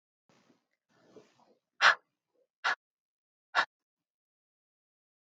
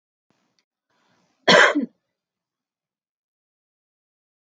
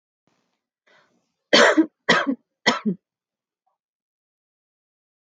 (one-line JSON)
{"exhalation_length": "5.3 s", "exhalation_amplitude": 11081, "exhalation_signal_mean_std_ratio": 0.18, "cough_length": "4.5 s", "cough_amplitude": 27764, "cough_signal_mean_std_ratio": 0.21, "three_cough_length": "5.3 s", "three_cough_amplitude": 27725, "three_cough_signal_mean_std_ratio": 0.28, "survey_phase": "beta (2021-08-13 to 2022-03-07)", "age": "45-64", "gender": "Female", "wearing_mask": "No", "symptom_none": true, "smoker_status": "Current smoker (11 or more cigarettes per day)", "respiratory_condition_asthma": false, "respiratory_condition_other": false, "recruitment_source": "REACT", "submission_delay": "4 days", "covid_test_result": "Negative", "covid_test_method": "RT-qPCR"}